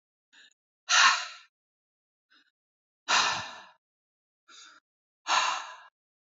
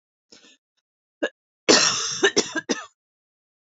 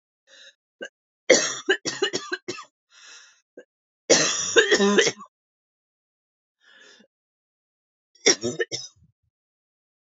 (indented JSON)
{
  "exhalation_length": "6.4 s",
  "exhalation_amplitude": 12252,
  "exhalation_signal_mean_std_ratio": 0.32,
  "cough_length": "3.7 s",
  "cough_amplitude": 23961,
  "cough_signal_mean_std_ratio": 0.35,
  "three_cough_length": "10.1 s",
  "three_cough_amplitude": 26535,
  "three_cough_signal_mean_std_ratio": 0.33,
  "survey_phase": "beta (2021-08-13 to 2022-03-07)",
  "age": "18-44",
  "gender": "Female",
  "wearing_mask": "No",
  "symptom_cough_any": true,
  "symptom_sore_throat": true,
  "symptom_fatigue": true,
  "symptom_headache": true,
  "symptom_onset": "6 days",
  "smoker_status": "Never smoked",
  "respiratory_condition_asthma": true,
  "respiratory_condition_other": false,
  "recruitment_source": "Test and Trace",
  "submission_delay": "4 days",
  "covid_test_result": "Negative",
  "covid_test_method": "RT-qPCR"
}